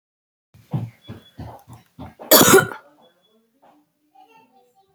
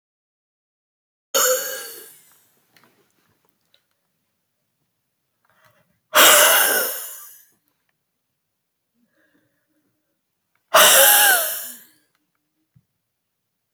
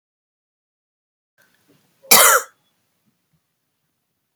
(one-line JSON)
{"three_cough_length": "4.9 s", "three_cough_amplitude": 32768, "three_cough_signal_mean_std_ratio": 0.26, "exhalation_length": "13.7 s", "exhalation_amplitude": 32768, "exhalation_signal_mean_std_ratio": 0.3, "cough_length": "4.4 s", "cough_amplitude": 32768, "cough_signal_mean_std_ratio": 0.21, "survey_phase": "beta (2021-08-13 to 2022-03-07)", "age": "18-44", "gender": "Female", "wearing_mask": "No", "symptom_abdominal_pain": true, "symptom_headache": true, "symptom_onset": "9 days", "smoker_status": "Never smoked", "respiratory_condition_asthma": false, "respiratory_condition_other": false, "recruitment_source": "Test and Trace", "submission_delay": "3 days", "covid_test_result": "Positive", "covid_test_method": "RT-qPCR", "covid_ct_value": 15.0, "covid_ct_gene": "ORF1ab gene", "covid_ct_mean": 15.4, "covid_viral_load": "8900000 copies/ml", "covid_viral_load_category": "High viral load (>1M copies/ml)"}